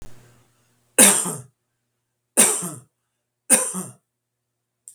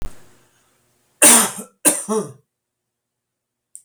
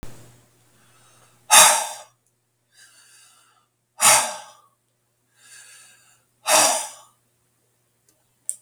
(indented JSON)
{
  "three_cough_length": "4.9 s",
  "three_cough_amplitude": 32768,
  "three_cough_signal_mean_std_ratio": 0.31,
  "cough_length": "3.8 s",
  "cough_amplitude": 32768,
  "cough_signal_mean_std_ratio": 0.32,
  "exhalation_length": "8.6 s",
  "exhalation_amplitude": 32768,
  "exhalation_signal_mean_std_ratio": 0.27,
  "survey_phase": "beta (2021-08-13 to 2022-03-07)",
  "age": "65+",
  "gender": "Male",
  "wearing_mask": "No",
  "symptom_none": true,
  "smoker_status": "Never smoked",
  "respiratory_condition_asthma": false,
  "respiratory_condition_other": false,
  "recruitment_source": "REACT",
  "submission_delay": "2 days",
  "covid_test_result": "Negative",
  "covid_test_method": "RT-qPCR",
  "influenza_a_test_result": "Negative",
  "influenza_b_test_result": "Negative"
}